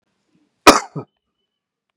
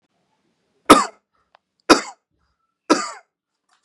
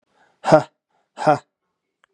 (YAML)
cough_length: 2.0 s
cough_amplitude: 32768
cough_signal_mean_std_ratio: 0.2
three_cough_length: 3.8 s
three_cough_amplitude: 32768
three_cough_signal_mean_std_ratio: 0.22
exhalation_length: 2.1 s
exhalation_amplitude: 32767
exhalation_signal_mean_std_ratio: 0.28
survey_phase: beta (2021-08-13 to 2022-03-07)
age: 18-44
gender: Male
wearing_mask: 'No'
symptom_none: true
symptom_onset: 8 days
smoker_status: Current smoker (1 to 10 cigarettes per day)
respiratory_condition_asthma: false
respiratory_condition_other: false
recruitment_source: REACT
submission_delay: 1 day
covid_test_result: Negative
covid_test_method: RT-qPCR